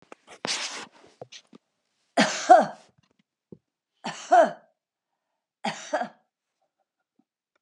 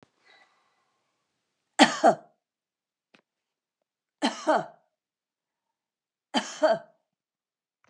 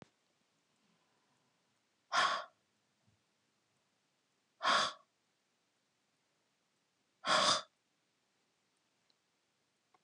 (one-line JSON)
{"three_cough_length": "7.6 s", "three_cough_amplitude": 25478, "three_cough_signal_mean_std_ratio": 0.26, "cough_length": "7.9 s", "cough_amplitude": 26985, "cough_signal_mean_std_ratio": 0.23, "exhalation_length": "10.0 s", "exhalation_amplitude": 4453, "exhalation_signal_mean_std_ratio": 0.25, "survey_phase": "alpha (2021-03-01 to 2021-08-12)", "age": "65+", "gender": "Female", "wearing_mask": "No", "symptom_none": true, "smoker_status": "Never smoked", "respiratory_condition_asthma": false, "respiratory_condition_other": false, "recruitment_source": "REACT", "submission_delay": "1 day", "covid_test_result": "Negative", "covid_test_method": "RT-qPCR"}